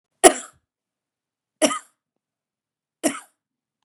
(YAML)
three_cough_length: 3.8 s
three_cough_amplitude: 32768
three_cough_signal_mean_std_ratio: 0.19
survey_phase: beta (2021-08-13 to 2022-03-07)
age: 45-64
gender: Female
wearing_mask: 'No'
symptom_fatigue: true
smoker_status: Ex-smoker
respiratory_condition_asthma: true
respiratory_condition_other: false
recruitment_source: REACT
submission_delay: 1 day
covid_test_result: Negative
covid_test_method: RT-qPCR
influenza_a_test_result: Unknown/Void
influenza_b_test_result: Unknown/Void